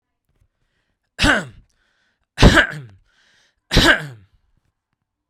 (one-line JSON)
{"three_cough_length": "5.3 s", "three_cough_amplitude": 32768, "three_cough_signal_mean_std_ratio": 0.3, "survey_phase": "beta (2021-08-13 to 2022-03-07)", "age": "45-64", "gender": "Male", "wearing_mask": "No", "symptom_none": true, "smoker_status": "Never smoked", "respiratory_condition_asthma": false, "respiratory_condition_other": false, "recruitment_source": "REACT", "submission_delay": "1 day", "covid_test_result": "Negative", "covid_test_method": "RT-qPCR"}